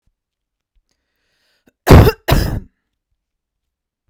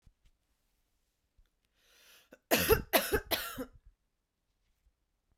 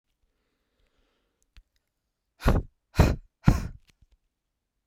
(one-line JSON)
{"cough_length": "4.1 s", "cough_amplitude": 32768, "cough_signal_mean_std_ratio": 0.26, "three_cough_length": "5.4 s", "three_cough_amplitude": 9496, "three_cough_signal_mean_std_ratio": 0.28, "exhalation_length": "4.9 s", "exhalation_amplitude": 23304, "exhalation_signal_mean_std_ratio": 0.25, "survey_phase": "beta (2021-08-13 to 2022-03-07)", "age": "18-44", "gender": "Female", "wearing_mask": "No", "symptom_none": true, "smoker_status": "Never smoked", "respiratory_condition_asthma": false, "respiratory_condition_other": false, "recruitment_source": "REACT", "submission_delay": "0 days", "covid_test_result": "Negative", "covid_test_method": "RT-qPCR", "influenza_a_test_result": "Negative", "influenza_b_test_result": "Negative"}